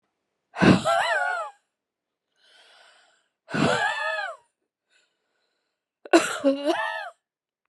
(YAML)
exhalation_length: 7.7 s
exhalation_amplitude: 22713
exhalation_signal_mean_std_ratio: 0.41
survey_phase: beta (2021-08-13 to 2022-03-07)
age: 45-64
gender: Female
wearing_mask: 'No'
symptom_cough_any: true
symptom_new_continuous_cough: true
symptom_runny_or_blocked_nose: true
symptom_shortness_of_breath: true
symptom_abdominal_pain: true
symptom_fatigue: true
symptom_headache: true
symptom_change_to_sense_of_smell_or_taste: true
symptom_loss_of_taste: true
symptom_onset: 4 days
smoker_status: Ex-smoker
respiratory_condition_asthma: false
respiratory_condition_other: false
recruitment_source: Test and Trace
submission_delay: 1 day
covid_test_result: Positive
covid_test_method: RT-qPCR
covid_ct_value: 17.8
covid_ct_gene: ORF1ab gene
covid_ct_mean: 18.3
covid_viral_load: 1000000 copies/ml
covid_viral_load_category: High viral load (>1M copies/ml)